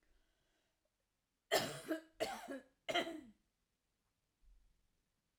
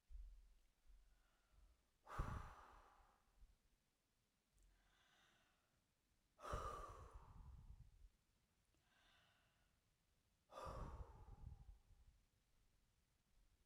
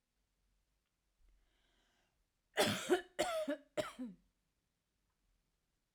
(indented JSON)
{
  "three_cough_length": "5.4 s",
  "three_cough_amplitude": 3131,
  "three_cough_signal_mean_std_ratio": 0.32,
  "exhalation_length": "13.7 s",
  "exhalation_amplitude": 705,
  "exhalation_signal_mean_std_ratio": 0.43,
  "cough_length": "5.9 s",
  "cough_amplitude": 3293,
  "cough_signal_mean_std_ratio": 0.31,
  "survey_phase": "alpha (2021-03-01 to 2021-08-12)",
  "age": "45-64",
  "gender": "Female",
  "wearing_mask": "No",
  "symptom_none": true,
  "smoker_status": "Ex-smoker",
  "respiratory_condition_asthma": false,
  "respiratory_condition_other": false,
  "recruitment_source": "REACT",
  "submission_delay": "3 days",
  "covid_test_result": "Negative",
  "covid_test_method": "RT-qPCR"
}